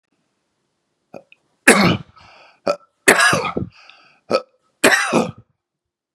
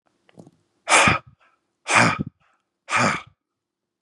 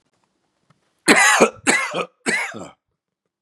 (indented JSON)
{
  "three_cough_length": "6.1 s",
  "three_cough_amplitude": 32768,
  "three_cough_signal_mean_std_ratio": 0.36,
  "exhalation_length": "4.0 s",
  "exhalation_amplitude": 28997,
  "exhalation_signal_mean_std_ratio": 0.37,
  "cough_length": "3.4 s",
  "cough_amplitude": 32767,
  "cough_signal_mean_std_ratio": 0.42,
  "survey_phase": "beta (2021-08-13 to 2022-03-07)",
  "age": "45-64",
  "gender": "Male",
  "wearing_mask": "No",
  "symptom_cough_any": true,
  "symptom_runny_or_blocked_nose": true,
  "symptom_sore_throat": true,
  "symptom_fatigue": true,
  "symptom_onset": "5 days",
  "smoker_status": "Never smoked",
  "respiratory_condition_asthma": false,
  "respiratory_condition_other": false,
  "recruitment_source": "Test and Trace",
  "submission_delay": "2 days",
  "covid_test_result": "Positive",
  "covid_test_method": "RT-qPCR",
  "covid_ct_value": 26.4,
  "covid_ct_gene": "ORF1ab gene",
  "covid_ct_mean": 26.7,
  "covid_viral_load": "1700 copies/ml",
  "covid_viral_load_category": "Minimal viral load (< 10K copies/ml)"
}